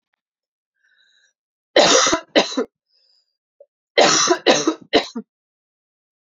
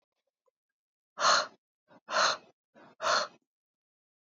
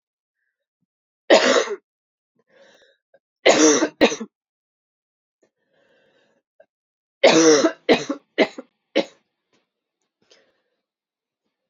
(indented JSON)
{
  "cough_length": "6.3 s",
  "cough_amplitude": 32768,
  "cough_signal_mean_std_ratio": 0.37,
  "exhalation_length": "4.4 s",
  "exhalation_amplitude": 8672,
  "exhalation_signal_mean_std_ratio": 0.33,
  "three_cough_length": "11.7 s",
  "three_cough_amplitude": 28345,
  "three_cough_signal_mean_std_ratio": 0.3,
  "survey_phase": "alpha (2021-03-01 to 2021-08-12)",
  "age": "18-44",
  "gender": "Female",
  "wearing_mask": "No",
  "symptom_cough_any": true,
  "symptom_new_continuous_cough": true,
  "symptom_fatigue": true,
  "symptom_fever_high_temperature": true,
  "symptom_headache": true,
  "symptom_onset": "3 days",
  "smoker_status": "Never smoked",
  "respiratory_condition_asthma": false,
  "respiratory_condition_other": false,
  "recruitment_source": "Test and Trace",
  "submission_delay": "1 day",
  "covid_test_result": "Positive",
  "covid_test_method": "RT-qPCR",
  "covid_ct_value": 16.5,
  "covid_ct_gene": "ORF1ab gene",
  "covid_ct_mean": 17.3,
  "covid_viral_load": "2100000 copies/ml",
  "covid_viral_load_category": "High viral load (>1M copies/ml)"
}